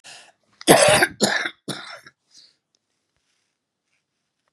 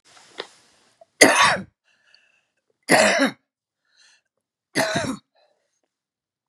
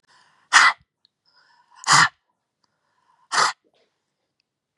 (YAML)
cough_length: 4.5 s
cough_amplitude: 32768
cough_signal_mean_std_ratio: 0.31
three_cough_length: 6.5 s
three_cough_amplitude: 32768
three_cough_signal_mean_std_ratio: 0.32
exhalation_length: 4.8 s
exhalation_amplitude: 32413
exhalation_signal_mean_std_ratio: 0.27
survey_phase: beta (2021-08-13 to 2022-03-07)
age: 45-64
gender: Female
wearing_mask: 'No'
symptom_none: true
smoker_status: Ex-smoker
respiratory_condition_asthma: false
respiratory_condition_other: false
recruitment_source: REACT
submission_delay: 1 day
covid_test_result: Negative
covid_test_method: RT-qPCR